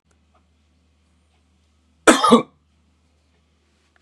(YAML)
cough_length: 4.0 s
cough_amplitude: 32768
cough_signal_mean_std_ratio: 0.21
survey_phase: beta (2021-08-13 to 2022-03-07)
age: 18-44
gender: Male
wearing_mask: 'No'
symptom_none: true
smoker_status: Current smoker (1 to 10 cigarettes per day)
respiratory_condition_asthma: false
respiratory_condition_other: false
recruitment_source: REACT
submission_delay: 4 days
covid_test_result: Negative
covid_test_method: RT-qPCR
influenza_a_test_result: Negative
influenza_b_test_result: Negative